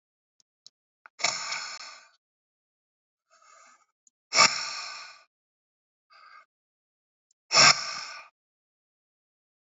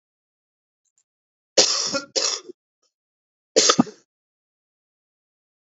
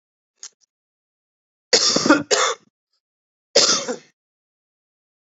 exhalation_length: 9.6 s
exhalation_amplitude: 24939
exhalation_signal_mean_std_ratio: 0.24
cough_length: 5.6 s
cough_amplitude: 28334
cough_signal_mean_std_ratio: 0.27
three_cough_length: 5.4 s
three_cough_amplitude: 28974
three_cough_signal_mean_std_ratio: 0.33
survey_phase: beta (2021-08-13 to 2022-03-07)
age: 45-64
gender: Male
wearing_mask: 'No'
symptom_none: true
smoker_status: Current smoker (11 or more cigarettes per day)
respiratory_condition_asthma: false
respiratory_condition_other: false
recruitment_source: REACT
submission_delay: 1 day
covid_test_result: Negative
covid_test_method: RT-qPCR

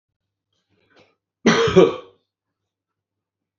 cough_length: 3.6 s
cough_amplitude: 28439
cough_signal_mean_std_ratio: 0.28
survey_phase: beta (2021-08-13 to 2022-03-07)
age: 65+
gender: Male
wearing_mask: 'No'
symptom_runny_or_blocked_nose: true
symptom_headache: true
symptom_onset: 4 days
smoker_status: Never smoked
respiratory_condition_asthma: true
respiratory_condition_other: false
recruitment_source: REACT
submission_delay: 1 day
covid_test_result: Negative
covid_test_method: RT-qPCR
influenza_a_test_result: Negative
influenza_b_test_result: Negative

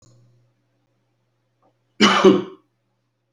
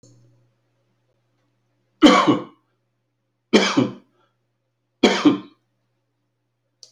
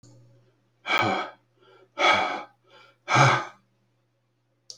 cough_length: 3.3 s
cough_amplitude: 27316
cough_signal_mean_std_ratio: 0.28
three_cough_length: 6.9 s
three_cough_amplitude: 32768
three_cough_signal_mean_std_ratio: 0.29
exhalation_length: 4.8 s
exhalation_amplitude: 19176
exhalation_signal_mean_std_ratio: 0.39
survey_phase: beta (2021-08-13 to 2022-03-07)
age: 65+
gender: Male
wearing_mask: 'No'
symptom_none: true
symptom_onset: 8 days
smoker_status: Never smoked
respiratory_condition_asthma: false
respiratory_condition_other: false
recruitment_source: REACT
submission_delay: 2 days
covid_test_result: Negative
covid_test_method: RT-qPCR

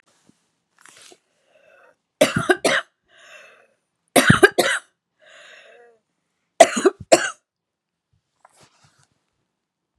three_cough_length: 10.0 s
three_cough_amplitude: 32768
three_cough_signal_mean_std_ratio: 0.25
survey_phase: beta (2021-08-13 to 2022-03-07)
age: 18-44
gender: Female
wearing_mask: 'No'
symptom_none: true
symptom_onset: 12 days
smoker_status: Current smoker (1 to 10 cigarettes per day)
respiratory_condition_asthma: false
respiratory_condition_other: false
recruitment_source: REACT
submission_delay: 4 days
covid_test_result: Negative
covid_test_method: RT-qPCR
influenza_a_test_result: Negative
influenza_b_test_result: Negative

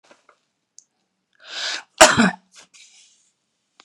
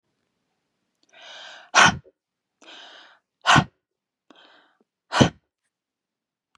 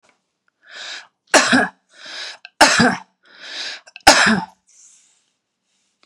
cough_length: 3.8 s
cough_amplitude: 32768
cough_signal_mean_std_ratio: 0.24
exhalation_length: 6.6 s
exhalation_amplitude: 28922
exhalation_signal_mean_std_ratio: 0.23
three_cough_length: 6.1 s
three_cough_amplitude: 32768
three_cough_signal_mean_std_ratio: 0.36
survey_phase: beta (2021-08-13 to 2022-03-07)
age: 45-64
gender: Female
wearing_mask: 'No'
symptom_none: true
symptom_onset: 2 days
smoker_status: Ex-smoker
respiratory_condition_asthma: false
respiratory_condition_other: false
recruitment_source: REACT
submission_delay: 3 days
covid_test_result: Negative
covid_test_method: RT-qPCR
influenza_a_test_result: Negative
influenza_b_test_result: Negative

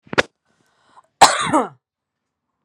cough_length: 2.6 s
cough_amplitude: 32768
cough_signal_mean_std_ratio: 0.27
survey_phase: beta (2021-08-13 to 2022-03-07)
age: 18-44
gender: Female
wearing_mask: 'No'
symptom_none: true
smoker_status: Ex-smoker
respiratory_condition_asthma: false
respiratory_condition_other: false
recruitment_source: REACT
submission_delay: 1 day
covid_test_result: Negative
covid_test_method: RT-qPCR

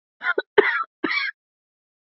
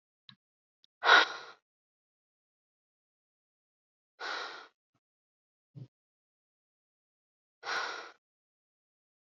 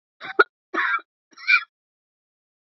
cough_length: 2.0 s
cough_amplitude: 27839
cough_signal_mean_std_ratio: 0.4
exhalation_length: 9.2 s
exhalation_amplitude: 11108
exhalation_signal_mean_std_ratio: 0.19
three_cough_length: 2.6 s
three_cough_amplitude: 26076
three_cough_signal_mean_std_ratio: 0.3
survey_phase: beta (2021-08-13 to 2022-03-07)
age: 45-64
gender: Female
wearing_mask: 'No'
symptom_shortness_of_breath: true
symptom_fatigue: true
symptom_headache: true
symptom_change_to_sense_of_smell_or_taste: true
symptom_onset: 13 days
smoker_status: Never smoked
respiratory_condition_asthma: false
respiratory_condition_other: false
recruitment_source: REACT
submission_delay: 4 days
covid_test_result: Negative
covid_test_method: RT-qPCR
influenza_a_test_result: Negative
influenza_b_test_result: Negative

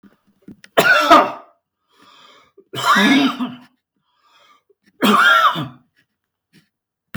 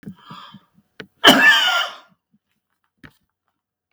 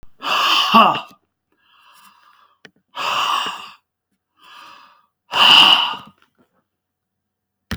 three_cough_length: 7.2 s
three_cough_amplitude: 32768
three_cough_signal_mean_std_ratio: 0.42
cough_length: 3.9 s
cough_amplitude: 32768
cough_signal_mean_std_ratio: 0.33
exhalation_length: 7.8 s
exhalation_amplitude: 32767
exhalation_signal_mean_std_ratio: 0.38
survey_phase: beta (2021-08-13 to 2022-03-07)
age: 65+
gender: Male
wearing_mask: 'No'
symptom_none: true
smoker_status: Ex-smoker
respiratory_condition_asthma: false
respiratory_condition_other: true
recruitment_source: REACT
submission_delay: 6 days
covid_test_result: Negative
covid_test_method: RT-qPCR
influenza_a_test_result: Negative
influenza_b_test_result: Negative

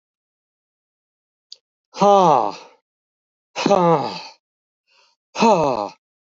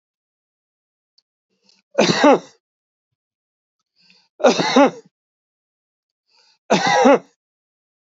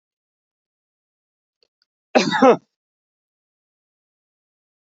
exhalation_length: 6.4 s
exhalation_amplitude: 27645
exhalation_signal_mean_std_ratio: 0.36
three_cough_length: 8.0 s
three_cough_amplitude: 27986
three_cough_signal_mean_std_ratio: 0.31
cough_length: 4.9 s
cough_amplitude: 28132
cough_signal_mean_std_ratio: 0.2
survey_phase: beta (2021-08-13 to 2022-03-07)
age: 65+
gender: Male
wearing_mask: 'No'
symptom_none: true
smoker_status: Never smoked
respiratory_condition_asthma: false
respiratory_condition_other: false
recruitment_source: REACT
submission_delay: 1 day
covid_test_result: Negative
covid_test_method: RT-qPCR
influenza_a_test_result: Negative
influenza_b_test_result: Negative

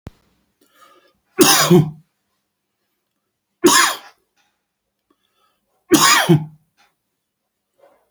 three_cough_length: 8.1 s
three_cough_amplitude: 32768
three_cough_signal_mean_std_ratio: 0.32
survey_phase: beta (2021-08-13 to 2022-03-07)
age: 45-64
gender: Male
wearing_mask: 'No'
symptom_other: true
smoker_status: Never smoked
respiratory_condition_asthma: false
respiratory_condition_other: false
recruitment_source: REACT
submission_delay: 2 days
covid_test_result: Negative
covid_test_method: RT-qPCR
influenza_a_test_result: Negative
influenza_b_test_result: Negative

